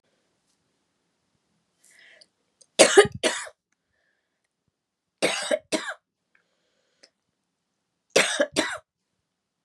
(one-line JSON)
{"three_cough_length": "9.6 s", "three_cough_amplitude": 32131, "three_cough_signal_mean_std_ratio": 0.24, "survey_phase": "beta (2021-08-13 to 2022-03-07)", "age": "45-64", "gender": "Female", "wearing_mask": "No", "symptom_cough_any": true, "symptom_runny_or_blocked_nose": true, "symptom_sore_throat": true, "symptom_fever_high_temperature": true, "symptom_headache": true, "smoker_status": "Never smoked", "respiratory_condition_asthma": false, "respiratory_condition_other": false, "recruitment_source": "Test and Trace", "submission_delay": "-1 day", "covid_test_result": "Positive", "covid_test_method": "LFT"}